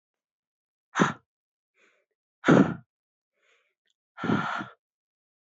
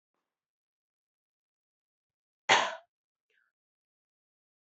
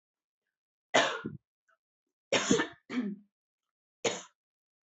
{
  "exhalation_length": "5.5 s",
  "exhalation_amplitude": 15154,
  "exhalation_signal_mean_std_ratio": 0.26,
  "cough_length": "4.6 s",
  "cough_amplitude": 10741,
  "cough_signal_mean_std_ratio": 0.16,
  "three_cough_length": "4.9 s",
  "three_cough_amplitude": 10026,
  "three_cough_signal_mean_std_ratio": 0.33,
  "survey_phase": "beta (2021-08-13 to 2022-03-07)",
  "age": "18-44",
  "gender": "Female",
  "wearing_mask": "No",
  "symptom_none": true,
  "smoker_status": "Ex-smoker",
  "respiratory_condition_asthma": false,
  "respiratory_condition_other": false,
  "recruitment_source": "REACT",
  "submission_delay": "1 day",
  "covid_test_result": "Negative",
  "covid_test_method": "RT-qPCR",
  "influenza_a_test_result": "Negative",
  "influenza_b_test_result": "Negative"
}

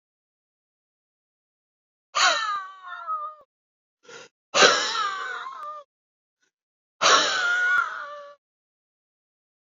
{
  "exhalation_length": "9.7 s",
  "exhalation_amplitude": 27936,
  "exhalation_signal_mean_std_ratio": 0.41,
  "survey_phase": "beta (2021-08-13 to 2022-03-07)",
  "age": "45-64",
  "gender": "Female",
  "wearing_mask": "No",
  "symptom_cough_any": true,
  "symptom_new_continuous_cough": true,
  "symptom_runny_or_blocked_nose": true,
  "symptom_fatigue": true,
  "symptom_fever_high_temperature": true,
  "symptom_headache": true,
  "smoker_status": "Never smoked",
  "respiratory_condition_asthma": true,
  "respiratory_condition_other": false,
  "recruitment_source": "Test and Trace",
  "submission_delay": "2 days",
  "covid_test_result": "Positive",
  "covid_test_method": "LFT"
}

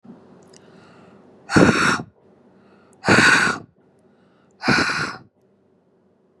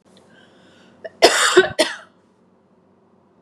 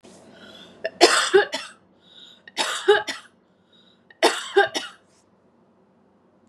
{
  "exhalation_length": "6.4 s",
  "exhalation_amplitude": 32625,
  "exhalation_signal_mean_std_ratio": 0.39,
  "cough_length": "3.4 s",
  "cough_amplitude": 32768,
  "cough_signal_mean_std_ratio": 0.31,
  "three_cough_length": "6.5 s",
  "three_cough_amplitude": 32494,
  "three_cough_signal_mean_std_ratio": 0.34,
  "survey_phase": "beta (2021-08-13 to 2022-03-07)",
  "age": "18-44",
  "gender": "Female",
  "wearing_mask": "No",
  "symptom_none": true,
  "smoker_status": "Never smoked",
  "respiratory_condition_asthma": false,
  "respiratory_condition_other": false,
  "recruitment_source": "REACT",
  "submission_delay": "3 days",
  "covid_test_result": "Negative",
  "covid_test_method": "RT-qPCR",
  "influenza_a_test_result": "Unknown/Void",
  "influenza_b_test_result": "Unknown/Void"
}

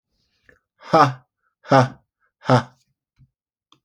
{
  "exhalation_length": "3.8 s",
  "exhalation_amplitude": 30089,
  "exhalation_signal_mean_std_ratio": 0.28,
  "survey_phase": "alpha (2021-03-01 to 2021-08-12)",
  "age": "45-64",
  "gender": "Male",
  "wearing_mask": "No",
  "symptom_none": true,
  "smoker_status": "Never smoked",
  "respiratory_condition_asthma": false,
  "respiratory_condition_other": false,
  "recruitment_source": "REACT",
  "submission_delay": "1 day",
  "covid_test_result": "Negative",
  "covid_test_method": "RT-qPCR"
}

